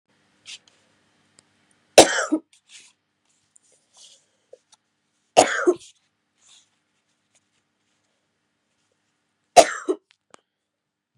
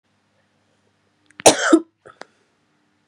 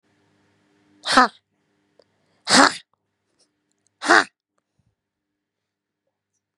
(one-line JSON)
{"three_cough_length": "11.2 s", "three_cough_amplitude": 32768, "three_cough_signal_mean_std_ratio": 0.18, "cough_length": "3.1 s", "cough_amplitude": 32768, "cough_signal_mean_std_ratio": 0.22, "exhalation_length": "6.6 s", "exhalation_amplitude": 32767, "exhalation_signal_mean_std_ratio": 0.21, "survey_phase": "beta (2021-08-13 to 2022-03-07)", "age": "18-44", "gender": "Female", "wearing_mask": "No", "symptom_cough_any": true, "symptom_sore_throat": true, "symptom_fatigue": true, "symptom_onset": "9 days", "smoker_status": "Never smoked", "respiratory_condition_asthma": false, "respiratory_condition_other": false, "recruitment_source": "Test and Trace", "submission_delay": "1 day", "covid_test_result": "Positive", "covid_test_method": "RT-qPCR", "covid_ct_value": 24.6, "covid_ct_gene": "ORF1ab gene"}